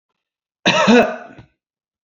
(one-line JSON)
{"cough_length": "2.0 s", "cough_amplitude": 29960, "cough_signal_mean_std_ratio": 0.39, "survey_phase": "beta (2021-08-13 to 2022-03-07)", "age": "45-64", "gender": "Male", "wearing_mask": "No", "symptom_none": true, "smoker_status": "Never smoked", "respiratory_condition_asthma": false, "respiratory_condition_other": false, "recruitment_source": "REACT", "submission_delay": "2 days", "covid_test_result": "Negative", "covid_test_method": "RT-qPCR", "influenza_a_test_result": "Negative", "influenza_b_test_result": "Negative"}